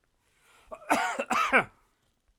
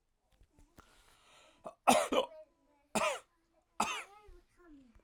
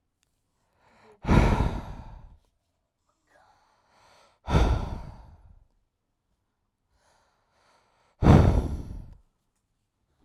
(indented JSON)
{
  "cough_length": "2.4 s",
  "cough_amplitude": 12740,
  "cough_signal_mean_std_ratio": 0.41,
  "three_cough_length": "5.0 s",
  "three_cough_amplitude": 9114,
  "three_cough_signal_mean_std_ratio": 0.31,
  "exhalation_length": "10.2 s",
  "exhalation_amplitude": 20123,
  "exhalation_signal_mean_std_ratio": 0.3,
  "survey_phase": "alpha (2021-03-01 to 2021-08-12)",
  "age": "18-44",
  "gender": "Male",
  "wearing_mask": "No",
  "symptom_none": true,
  "smoker_status": "Never smoked",
  "respiratory_condition_asthma": true,
  "respiratory_condition_other": false,
  "recruitment_source": "REACT",
  "submission_delay": "1 day",
  "covid_test_result": "Negative",
  "covid_test_method": "RT-qPCR"
}